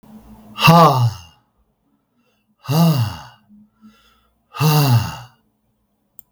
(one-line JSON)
{"exhalation_length": "6.3 s", "exhalation_amplitude": 32768, "exhalation_signal_mean_std_ratio": 0.42, "survey_phase": "beta (2021-08-13 to 2022-03-07)", "age": "65+", "gender": "Male", "wearing_mask": "No", "symptom_cough_any": true, "symptom_runny_or_blocked_nose": true, "symptom_sore_throat": true, "symptom_fever_high_temperature": true, "smoker_status": "Never smoked", "respiratory_condition_asthma": false, "respiratory_condition_other": false, "recruitment_source": "Test and Trace", "submission_delay": "2 days", "covid_test_result": "Positive", "covid_test_method": "LFT"}